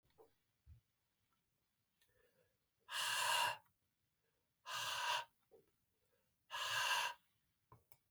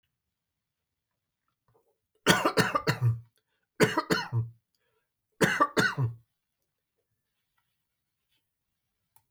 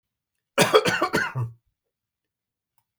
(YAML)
exhalation_length: 8.1 s
exhalation_amplitude: 1786
exhalation_signal_mean_std_ratio: 0.4
three_cough_length: 9.3 s
three_cough_amplitude: 14943
three_cough_signal_mean_std_ratio: 0.33
cough_length: 3.0 s
cough_amplitude: 23364
cough_signal_mean_std_ratio: 0.37
survey_phase: beta (2021-08-13 to 2022-03-07)
age: 65+
gender: Male
wearing_mask: 'No'
symptom_sore_throat: true
symptom_headache: true
smoker_status: Never smoked
respiratory_condition_asthma: false
respiratory_condition_other: false
recruitment_source: REACT
submission_delay: 1 day
covid_test_result: Positive
covid_test_method: RT-qPCR
covid_ct_value: 25.0
covid_ct_gene: E gene
influenza_a_test_result: Negative
influenza_b_test_result: Negative